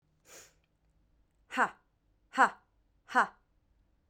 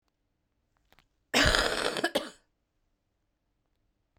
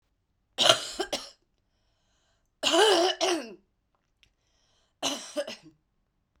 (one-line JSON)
{"exhalation_length": "4.1 s", "exhalation_amplitude": 9614, "exhalation_signal_mean_std_ratio": 0.23, "cough_length": "4.2 s", "cough_amplitude": 17499, "cough_signal_mean_std_ratio": 0.32, "three_cough_length": "6.4 s", "three_cough_amplitude": 26178, "three_cough_signal_mean_std_ratio": 0.36, "survey_phase": "beta (2021-08-13 to 2022-03-07)", "age": "45-64", "gender": "Female", "wearing_mask": "No", "symptom_cough_any": true, "symptom_runny_or_blocked_nose": true, "symptom_change_to_sense_of_smell_or_taste": true, "symptom_loss_of_taste": true, "symptom_other": true, "symptom_onset": "6 days", "smoker_status": "Never smoked", "respiratory_condition_asthma": false, "respiratory_condition_other": false, "recruitment_source": "Test and Trace", "submission_delay": "2 days", "covid_test_result": "Positive", "covid_test_method": "RT-qPCR", "covid_ct_value": 22.4, "covid_ct_gene": "ORF1ab gene", "covid_ct_mean": 22.9, "covid_viral_load": "30000 copies/ml", "covid_viral_load_category": "Low viral load (10K-1M copies/ml)"}